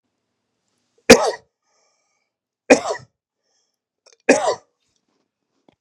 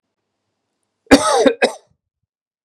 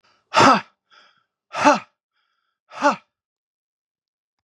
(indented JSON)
{
  "three_cough_length": "5.8 s",
  "three_cough_amplitude": 32768,
  "three_cough_signal_mean_std_ratio": 0.22,
  "cough_length": "2.6 s",
  "cough_amplitude": 32768,
  "cough_signal_mean_std_ratio": 0.32,
  "exhalation_length": "4.4 s",
  "exhalation_amplitude": 32430,
  "exhalation_signal_mean_std_ratio": 0.28,
  "survey_phase": "beta (2021-08-13 to 2022-03-07)",
  "age": "18-44",
  "gender": "Male",
  "wearing_mask": "No",
  "symptom_new_continuous_cough": true,
  "symptom_runny_or_blocked_nose": true,
  "symptom_sore_throat": true,
  "symptom_fever_high_temperature": true,
  "symptom_onset": "3 days",
  "smoker_status": "Never smoked",
  "respiratory_condition_asthma": false,
  "respiratory_condition_other": false,
  "recruitment_source": "Test and Trace",
  "submission_delay": "1 day",
  "covid_test_result": "Positive",
  "covid_test_method": "RT-qPCR",
  "covid_ct_value": 33.2,
  "covid_ct_gene": "ORF1ab gene"
}